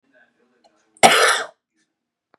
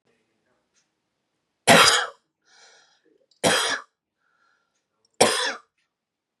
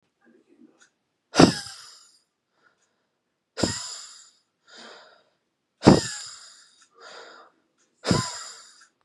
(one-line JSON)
{"cough_length": "2.4 s", "cough_amplitude": 32768, "cough_signal_mean_std_ratio": 0.31, "three_cough_length": "6.4 s", "three_cough_amplitude": 29416, "three_cough_signal_mean_std_ratio": 0.29, "exhalation_length": "9.0 s", "exhalation_amplitude": 32767, "exhalation_signal_mean_std_ratio": 0.23, "survey_phase": "beta (2021-08-13 to 2022-03-07)", "age": "18-44", "gender": "Male", "wearing_mask": "No", "symptom_runny_or_blocked_nose": true, "symptom_shortness_of_breath": true, "symptom_fatigue": true, "symptom_loss_of_taste": true, "smoker_status": "Current smoker (e-cigarettes or vapes only)", "respiratory_condition_asthma": true, "respiratory_condition_other": false, "recruitment_source": "REACT", "submission_delay": "2 days", "covid_test_result": "Negative", "covid_test_method": "RT-qPCR", "influenza_a_test_result": "Negative", "influenza_b_test_result": "Negative"}